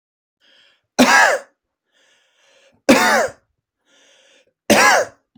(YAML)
three_cough_length: 5.4 s
three_cough_amplitude: 29760
three_cough_signal_mean_std_ratio: 0.38
survey_phase: beta (2021-08-13 to 2022-03-07)
age: 18-44
gender: Male
wearing_mask: 'No'
symptom_none: true
smoker_status: Ex-smoker
respiratory_condition_asthma: false
respiratory_condition_other: false
recruitment_source: REACT
submission_delay: 2 days
covid_test_result: Negative
covid_test_method: RT-qPCR
influenza_a_test_result: Negative
influenza_b_test_result: Negative